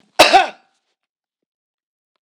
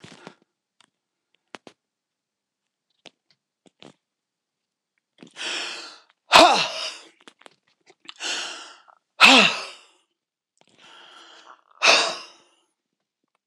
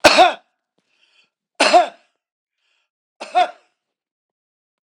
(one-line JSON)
{"cough_length": "2.3 s", "cough_amplitude": 26028, "cough_signal_mean_std_ratio": 0.26, "exhalation_length": "13.5 s", "exhalation_amplitude": 26028, "exhalation_signal_mean_std_ratio": 0.25, "three_cough_length": "4.9 s", "three_cough_amplitude": 26028, "three_cough_signal_mean_std_ratio": 0.29, "survey_phase": "beta (2021-08-13 to 2022-03-07)", "age": "65+", "gender": "Male", "wearing_mask": "No", "symptom_none": true, "smoker_status": "Ex-smoker", "respiratory_condition_asthma": false, "respiratory_condition_other": false, "recruitment_source": "REACT", "submission_delay": "2 days", "covid_test_result": "Negative", "covid_test_method": "RT-qPCR", "influenza_a_test_result": "Unknown/Void", "influenza_b_test_result": "Unknown/Void"}